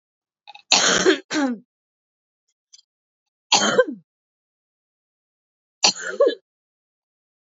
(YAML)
three_cough_length: 7.4 s
three_cough_amplitude: 32768
three_cough_signal_mean_std_ratio: 0.33
survey_phase: beta (2021-08-13 to 2022-03-07)
age: 18-44
gender: Female
wearing_mask: 'No'
symptom_cough_any: true
symptom_sore_throat: true
symptom_change_to_sense_of_smell_or_taste: true
smoker_status: Never smoked
respiratory_condition_asthma: false
respiratory_condition_other: false
recruitment_source: Test and Trace
submission_delay: 1 day
covid_test_result: Positive
covid_test_method: LFT